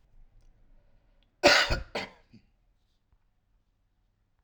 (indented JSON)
{
  "cough_length": "4.4 s",
  "cough_amplitude": 16254,
  "cough_signal_mean_std_ratio": 0.24,
  "survey_phase": "alpha (2021-03-01 to 2021-08-12)",
  "age": "18-44",
  "gender": "Male",
  "wearing_mask": "No",
  "symptom_none": true,
  "smoker_status": "Never smoked",
  "respiratory_condition_asthma": false,
  "respiratory_condition_other": false,
  "recruitment_source": "REACT",
  "submission_delay": "2 days",
  "covid_test_result": "Negative",
  "covid_test_method": "RT-qPCR"
}